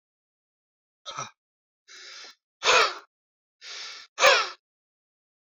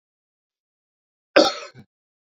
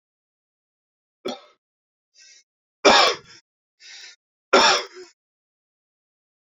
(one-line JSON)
{"exhalation_length": "5.5 s", "exhalation_amplitude": 18947, "exhalation_signal_mean_std_ratio": 0.29, "cough_length": "2.3 s", "cough_amplitude": 27558, "cough_signal_mean_std_ratio": 0.21, "three_cough_length": "6.5 s", "three_cough_amplitude": 27992, "three_cough_signal_mean_std_ratio": 0.25, "survey_phase": "beta (2021-08-13 to 2022-03-07)", "age": "45-64", "gender": "Male", "wearing_mask": "No", "symptom_none": true, "smoker_status": "Ex-smoker", "respiratory_condition_asthma": false, "respiratory_condition_other": false, "recruitment_source": "REACT", "submission_delay": "2 days", "covid_test_result": "Negative", "covid_test_method": "RT-qPCR"}